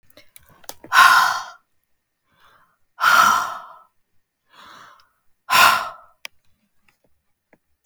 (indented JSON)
{
  "exhalation_length": "7.9 s",
  "exhalation_amplitude": 32768,
  "exhalation_signal_mean_std_ratio": 0.33,
  "survey_phase": "beta (2021-08-13 to 2022-03-07)",
  "age": "45-64",
  "gender": "Female",
  "wearing_mask": "No",
  "symptom_none": true,
  "smoker_status": "Never smoked",
  "respiratory_condition_asthma": true,
  "respiratory_condition_other": false,
  "recruitment_source": "REACT",
  "submission_delay": "2 days",
  "covid_test_result": "Negative",
  "covid_test_method": "RT-qPCR",
  "influenza_a_test_result": "Unknown/Void",
  "influenza_b_test_result": "Unknown/Void"
}